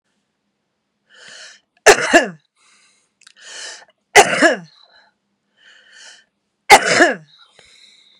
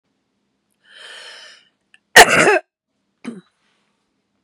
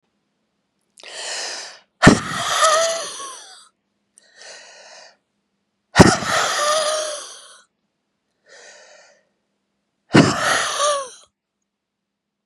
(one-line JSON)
{"three_cough_length": "8.2 s", "three_cough_amplitude": 32768, "three_cough_signal_mean_std_ratio": 0.28, "cough_length": "4.4 s", "cough_amplitude": 32768, "cough_signal_mean_std_ratio": 0.24, "exhalation_length": "12.5 s", "exhalation_amplitude": 32768, "exhalation_signal_mean_std_ratio": 0.37, "survey_phase": "beta (2021-08-13 to 2022-03-07)", "age": "65+", "gender": "Female", "wearing_mask": "No", "symptom_none": true, "smoker_status": "Ex-smoker", "respiratory_condition_asthma": false, "respiratory_condition_other": false, "recruitment_source": "REACT", "submission_delay": "1 day", "covid_test_result": "Negative", "covid_test_method": "RT-qPCR", "influenza_a_test_result": "Unknown/Void", "influenza_b_test_result": "Unknown/Void"}